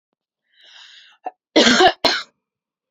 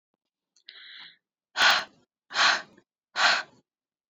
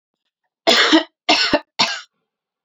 {"cough_length": "2.9 s", "cough_amplitude": 29484, "cough_signal_mean_std_ratio": 0.35, "exhalation_length": "4.1 s", "exhalation_amplitude": 15054, "exhalation_signal_mean_std_ratio": 0.35, "three_cough_length": "2.6 s", "three_cough_amplitude": 32338, "three_cough_signal_mean_std_ratio": 0.45, "survey_phase": "alpha (2021-03-01 to 2021-08-12)", "age": "18-44", "gender": "Female", "wearing_mask": "No", "symptom_cough_any": true, "symptom_shortness_of_breath": true, "symptom_fatigue": true, "symptom_fever_high_temperature": true, "symptom_headache": true, "symptom_onset": "3 days", "smoker_status": "Ex-smoker", "respiratory_condition_asthma": false, "respiratory_condition_other": false, "recruitment_source": "Test and Trace", "submission_delay": "2 days", "covid_test_result": "Positive", "covid_test_method": "LAMP"}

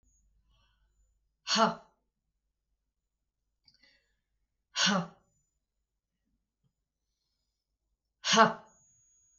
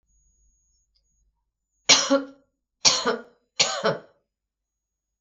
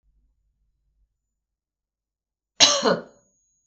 {"exhalation_length": "9.4 s", "exhalation_amplitude": 12251, "exhalation_signal_mean_std_ratio": 0.22, "three_cough_length": "5.2 s", "three_cough_amplitude": 28939, "three_cough_signal_mean_std_ratio": 0.31, "cough_length": "3.7 s", "cough_amplitude": 32766, "cough_signal_mean_std_ratio": 0.23, "survey_phase": "beta (2021-08-13 to 2022-03-07)", "age": "45-64", "gender": "Female", "wearing_mask": "No", "symptom_new_continuous_cough": true, "symptom_runny_or_blocked_nose": true, "symptom_sore_throat": true, "symptom_fatigue": true, "symptom_other": true, "symptom_onset": "5 days", "smoker_status": "Ex-smoker", "respiratory_condition_asthma": false, "respiratory_condition_other": false, "recruitment_source": "Test and Trace", "submission_delay": "2 days", "covid_test_result": "Positive", "covid_test_method": "RT-qPCR", "covid_ct_value": 20.2, "covid_ct_gene": "ORF1ab gene", "covid_ct_mean": 20.6, "covid_viral_load": "180000 copies/ml", "covid_viral_load_category": "Low viral load (10K-1M copies/ml)"}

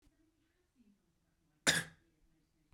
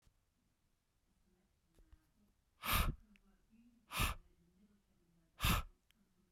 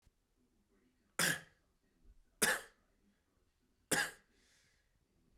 {"cough_length": "2.7 s", "cough_amplitude": 7036, "cough_signal_mean_std_ratio": 0.2, "exhalation_length": "6.3 s", "exhalation_amplitude": 2603, "exhalation_signal_mean_std_ratio": 0.29, "three_cough_length": "5.4 s", "three_cough_amplitude": 5856, "three_cough_signal_mean_std_ratio": 0.26, "survey_phase": "beta (2021-08-13 to 2022-03-07)", "age": "18-44", "gender": "Male", "wearing_mask": "No", "symptom_cough_any": true, "symptom_runny_or_blocked_nose": true, "symptom_onset": "3 days", "smoker_status": "Never smoked", "respiratory_condition_asthma": false, "respiratory_condition_other": false, "recruitment_source": "Test and Trace", "submission_delay": "2 days", "covid_test_result": "Positive", "covid_test_method": "RT-qPCR"}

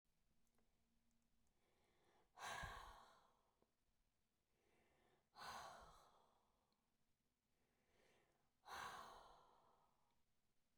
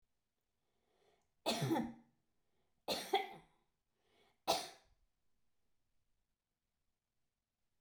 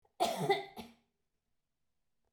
{"exhalation_length": "10.8 s", "exhalation_amplitude": 342, "exhalation_signal_mean_std_ratio": 0.41, "three_cough_length": "7.8 s", "three_cough_amplitude": 2949, "three_cough_signal_mean_std_ratio": 0.28, "cough_length": "2.3 s", "cough_amplitude": 4074, "cough_signal_mean_std_ratio": 0.35, "survey_phase": "beta (2021-08-13 to 2022-03-07)", "age": "65+", "gender": "Female", "wearing_mask": "No", "symptom_none": true, "smoker_status": "Ex-smoker", "respiratory_condition_asthma": false, "respiratory_condition_other": false, "recruitment_source": "REACT", "submission_delay": "1 day", "covid_test_result": "Negative", "covid_test_method": "RT-qPCR"}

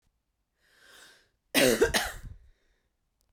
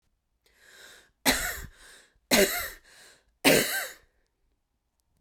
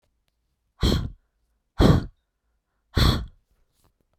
{"cough_length": "3.3 s", "cough_amplitude": 13030, "cough_signal_mean_std_ratio": 0.32, "three_cough_length": "5.2 s", "three_cough_amplitude": 16600, "three_cough_signal_mean_std_ratio": 0.34, "exhalation_length": "4.2 s", "exhalation_amplitude": 21520, "exhalation_signal_mean_std_ratio": 0.33, "survey_phase": "beta (2021-08-13 to 2022-03-07)", "age": "18-44", "gender": "Female", "wearing_mask": "No", "symptom_cough_any": true, "symptom_runny_or_blocked_nose": true, "symptom_fatigue": true, "symptom_headache": true, "symptom_onset": "3 days", "smoker_status": "Ex-smoker", "respiratory_condition_asthma": true, "respiratory_condition_other": false, "recruitment_source": "Test and Trace", "submission_delay": "2 days", "covid_test_result": "Negative", "covid_test_method": "ePCR"}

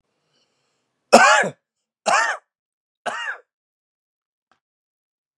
{"three_cough_length": "5.4 s", "three_cough_amplitude": 32768, "three_cough_signal_mean_std_ratio": 0.27, "survey_phase": "beta (2021-08-13 to 2022-03-07)", "age": "18-44", "gender": "Male", "wearing_mask": "No", "symptom_fatigue": true, "symptom_headache": true, "symptom_other": true, "symptom_onset": "4 days", "smoker_status": "Never smoked", "respiratory_condition_asthma": false, "respiratory_condition_other": false, "recruitment_source": "Test and Trace", "submission_delay": "2 days", "covid_test_result": "Positive", "covid_test_method": "RT-qPCR", "covid_ct_value": 19.1, "covid_ct_gene": "ORF1ab gene", "covid_ct_mean": 19.5, "covid_viral_load": "410000 copies/ml", "covid_viral_load_category": "Low viral load (10K-1M copies/ml)"}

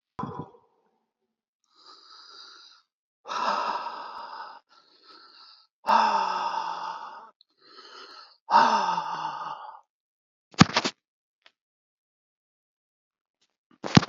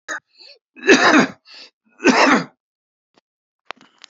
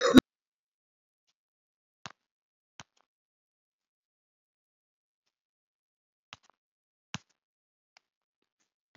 {"exhalation_length": "14.1 s", "exhalation_amplitude": 32537, "exhalation_signal_mean_std_ratio": 0.33, "three_cough_length": "4.1 s", "three_cough_amplitude": 28597, "three_cough_signal_mean_std_ratio": 0.37, "cough_length": "9.0 s", "cough_amplitude": 23121, "cough_signal_mean_std_ratio": 0.09, "survey_phase": "beta (2021-08-13 to 2022-03-07)", "age": "65+", "gender": "Male", "wearing_mask": "No", "symptom_cough_any": true, "symptom_runny_or_blocked_nose": true, "smoker_status": "Ex-smoker", "respiratory_condition_asthma": false, "respiratory_condition_other": false, "recruitment_source": "REACT", "submission_delay": "2 days", "covid_test_result": "Negative", "covid_test_method": "RT-qPCR", "influenza_a_test_result": "Negative", "influenza_b_test_result": "Negative"}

